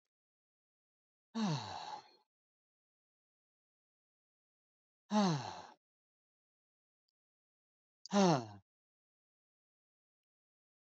{"exhalation_length": "10.8 s", "exhalation_amplitude": 4350, "exhalation_signal_mean_std_ratio": 0.25, "survey_phase": "beta (2021-08-13 to 2022-03-07)", "age": "45-64", "gender": "Male", "wearing_mask": "No", "symptom_none": true, "smoker_status": "Never smoked", "respiratory_condition_asthma": false, "respiratory_condition_other": false, "recruitment_source": "REACT", "submission_delay": "3 days", "covid_test_result": "Negative", "covid_test_method": "RT-qPCR", "covid_ct_value": 43.0, "covid_ct_gene": "N gene"}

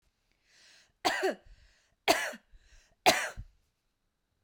{"three_cough_length": "4.4 s", "three_cough_amplitude": 14101, "three_cough_signal_mean_std_ratio": 0.3, "survey_phase": "beta (2021-08-13 to 2022-03-07)", "age": "45-64", "gender": "Female", "wearing_mask": "No", "symptom_fatigue": true, "symptom_onset": "2 days", "smoker_status": "Never smoked", "respiratory_condition_asthma": false, "respiratory_condition_other": false, "recruitment_source": "Test and Trace", "submission_delay": "2 days", "covid_test_result": "Negative", "covid_test_method": "RT-qPCR"}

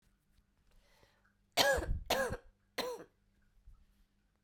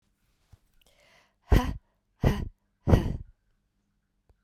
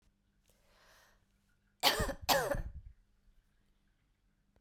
{"three_cough_length": "4.4 s", "three_cough_amplitude": 7871, "three_cough_signal_mean_std_ratio": 0.36, "exhalation_length": "4.4 s", "exhalation_amplitude": 18432, "exhalation_signal_mean_std_ratio": 0.28, "cough_length": "4.6 s", "cough_amplitude": 9615, "cough_signal_mean_std_ratio": 0.32, "survey_phase": "beta (2021-08-13 to 2022-03-07)", "age": "45-64", "gender": "Female", "wearing_mask": "No", "symptom_cough_any": true, "symptom_runny_or_blocked_nose": true, "symptom_fatigue": true, "symptom_fever_high_temperature": true, "symptom_headache": true, "smoker_status": "Never smoked", "respiratory_condition_asthma": false, "respiratory_condition_other": false, "recruitment_source": "Test and Trace", "submission_delay": "3 days", "covid_test_result": "Positive", "covid_test_method": "RT-qPCR", "covid_ct_value": 16.9, "covid_ct_gene": "ORF1ab gene", "covid_ct_mean": 17.2, "covid_viral_load": "2200000 copies/ml", "covid_viral_load_category": "High viral load (>1M copies/ml)"}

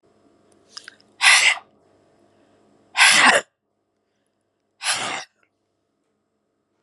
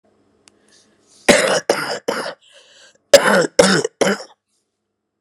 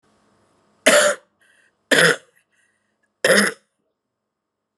{"exhalation_length": "6.8 s", "exhalation_amplitude": 32320, "exhalation_signal_mean_std_ratio": 0.31, "cough_length": "5.2 s", "cough_amplitude": 32768, "cough_signal_mean_std_ratio": 0.39, "three_cough_length": "4.8 s", "three_cough_amplitude": 31609, "three_cough_signal_mean_std_ratio": 0.33, "survey_phase": "beta (2021-08-13 to 2022-03-07)", "age": "45-64", "gender": "Female", "wearing_mask": "No", "symptom_cough_any": true, "symptom_runny_or_blocked_nose": true, "symptom_change_to_sense_of_smell_or_taste": true, "smoker_status": "Never smoked", "respiratory_condition_asthma": false, "respiratory_condition_other": false, "recruitment_source": "Test and Trace", "submission_delay": "0 days", "covid_test_result": "Negative", "covid_test_method": "RT-qPCR"}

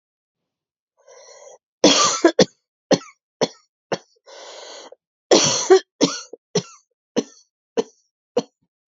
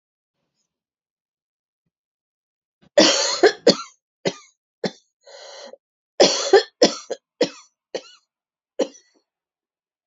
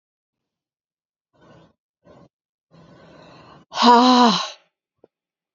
{"cough_length": "8.9 s", "cough_amplitude": 32767, "cough_signal_mean_std_ratio": 0.31, "three_cough_length": "10.1 s", "three_cough_amplitude": 30847, "three_cough_signal_mean_std_ratio": 0.27, "exhalation_length": "5.5 s", "exhalation_amplitude": 28873, "exhalation_signal_mean_std_ratio": 0.28, "survey_phase": "beta (2021-08-13 to 2022-03-07)", "age": "45-64", "gender": "Female", "wearing_mask": "No", "symptom_new_continuous_cough": true, "symptom_runny_or_blocked_nose": true, "symptom_shortness_of_breath": true, "symptom_sore_throat": true, "symptom_fatigue": true, "symptom_headache": true, "symptom_other": true, "symptom_onset": "3 days", "smoker_status": "Never smoked", "respiratory_condition_asthma": false, "respiratory_condition_other": false, "recruitment_source": "Test and Trace", "submission_delay": "2 days", "covid_test_result": "Positive", "covid_test_method": "RT-qPCR", "covid_ct_value": 27.6, "covid_ct_gene": "N gene"}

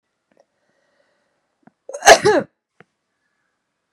{"cough_length": "3.9 s", "cough_amplitude": 32768, "cough_signal_mean_std_ratio": 0.21, "survey_phase": "beta (2021-08-13 to 2022-03-07)", "age": "45-64", "gender": "Female", "wearing_mask": "No", "symptom_runny_or_blocked_nose": true, "symptom_diarrhoea": true, "symptom_fatigue": true, "smoker_status": "Never smoked", "respiratory_condition_asthma": false, "respiratory_condition_other": false, "recruitment_source": "Test and Trace", "submission_delay": "2 days", "covid_test_result": "Positive", "covid_test_method": "LFT"}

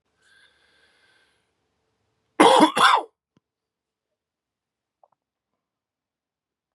{"cough_length": "6.7 s", "cough_amplitude": 31053, "cough_signal_mean_std_ratio": 0.22, "survey_phase": "beta (2021-08-13 to 2022-03-07)", "age": "18-44", "gender": "Male", "wearing_mask": "No", "symptom_cough_any": true, "symptom_runny_or_blocked_nose": true, "symptom_sore_throat": true, "symptom_fever_high_temperature": true, "symptom_onset": "4 days", "smoker_status": "Current smoker (1 to 10 cigarettes per day)", "respiratory_condition_asthma": false, "respiratory_condition_other": false, "recruitment_source": "Test and Trace", "submission_delay": "2 days", "covid_test_result": "Positive", "covid_test_method": "RT-qPCR", "covid_ct_value": 23.4, "covid_ct_gene": "ORF1ab gene", "covid_ct_mean": 24.1, "covid_viral_load": "12000 copies/ml", "covid_viral_load_category": "Low viral load (10K-1M copies/ml)"}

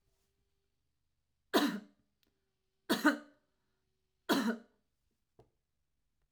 {"three_cough_length": "6.3 s", "three_cough_amplitude": 5819, "three_cough_signal_mean_std_ratio": 0.27, "survey_phase": "alpha (2021-03-01 to 2021-08-12)", "age": "45-64", "gender": "Female", "wearing_mask": "No", "symptom_none": true, "smoker_status": "Never smoked", "respiratory_condition_asthma": false, "respiratory_condition_other": false, "recruitment_source": "REACT", "submission_delay": "1 day", "covid_test_result": "Negative", "covid_test_method": "RT-qPCR"}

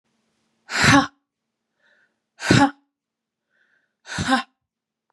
{"exhalation_length": "5.1 s", "exhalation_amplitude": 30331, "exhalation_signal_mean_std_ratio": 0.3, "survey_phase": "beta (2021-08-13 to 2022-03-07)", "age": "18-44", "gender": "Female", "wearing_mask": "No", "symptom_none": true, "smoker_status": "Never smoked", "respiratory_condition_asthma": true, "respiratory_condition_other": false, "recruitment_source": "Test and Trace", "submission_delay": "3 days", "covid_test_result": "Negative", "covid_test_method": "RT-qPCR"}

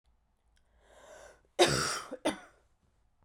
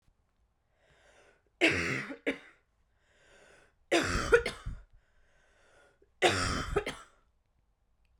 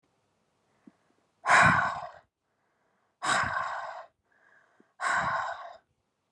{"cough_length": "3.2 s", "cough_amplitude": 10856, "cough_signal_mean_std_ratio": 0.31, "three_cough_length": "8.2 s", "three_cough_amplitude": 10976, "three_cough_signal_mean_std_ratio": 0.36, "exhalation_length": "6.3 s", "exhalation_amplitude": 12371, "exhalation_signal_mean_std_ratio": 0.4, "survey_phase": "beta (2021-08-13 to 2022-03-07)", "age": "18-44", "gender": "Female", "wearing_mask": "No", "symptom_cough_any": true, "symptom_new_continuous_cough": true, "symptom_sore_throat": true, "symptom_fatigue": true, "symptom_headache": true, "symptom_other": true, "symptom_onset": "3 days", "smoker_status": "Ex-smoker", "respiratory_condition_asthma": false, "respiratory_condition_other": false, "recruitment_source": "Test and Trace", "submission_delay": "2 days", "covid_test_result": "Positive", "covid_test_method": "RT-qPCR", "covid_ct_value": 12.2, "covid_ct_gene": "ORF1ab gene"}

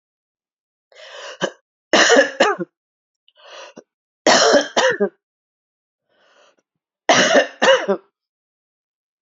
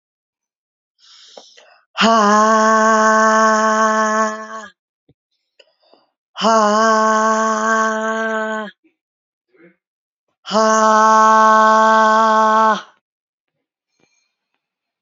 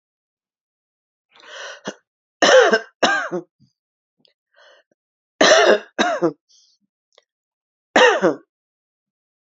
{"three_cough_length": "9.2 s", "three_cough_amplitude": 30769, "three_cough_signal_mean_std_ratio": 0.38, "exhalation_length": "15.0 s", "exhalation_amplitude": 30489, "exhalation_signal_mean_std_ratio": 0.57, "cough_length": "9.5 s", "cough_amplitude": 30241, "cough_signal_mean_std_ratio": 0.34, "survey_phase": "alpha (2021-03-01 to 2021-08-12)", "age": "45-64", "gender": "Female", "wearing_mask": "No", "symptom_cough_any": true, "symptom_fatigue": true, "symptom_fever_high_temperature": true, "symptom_headache": true, "smoker_status": "Never smoked", "respiratory_condition_asthma": false, "respiratory_condition_other": false, "recruitment_source": "Test and Trace", "submission_delay": "2 days", "covid_test_result": "Positive", "covid_test_method": "RT-qPCR"}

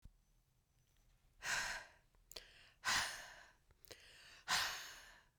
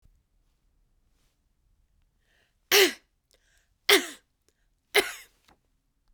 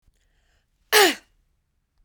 {"exhalation_length": "5.4 s", "exhalation_amplitude": 2235, "exhalation_signal_mean_std_ratio": 0.42, "three_cough_length": "6.1 s", "three_cough_amplitude": 20369, "three_cough_signal_mean_std_ratio": 0.21, "cough_length": "2.0 s", "cough_amplitude": 24381, "cough_signal_mean_std_ratio": 0.25, "survey_phase": "beta (2021-08-13 to 2022-03-07)", "age": "45-64", "gender": "Female", "wearing_mask": "No", "symptom_cough_any": true, "symptom_shortness_of_breath": true, "smoker_status": "Never smoked", "respiratory_condition_asthma": true, "respiratory_condition_other": false, "recruitment_source": "Test and Trace", "submission_delay": "2 days", "covid_test_result": "Positive", "covid_test_method": "RT-qPCR"}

